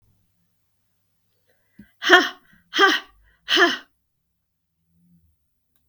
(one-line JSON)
{"exhalation_length": "5.9 s", "exhalation_amplitude": 32768, "exhalation_signal_mean_std_ratio": 0.27, "survey_phase": "beta (2021-08-13 to 2022-03-07)", "age": "65+", "gender": "Female", "wearing_mask": "No", "symptom_cough_any": true, "symptom_headache": true, "symptom_change_to_sense_of_smell_or_taste": true, "smoker_status": "Never smoked", "respiratory_condition_asthma": false, "respiratory_condition_other": false, "recruitment_source": "Test and Trace", "submission_delay": "0 days", "covid_test_result": "Negative", "covid_test_method": "LFT"}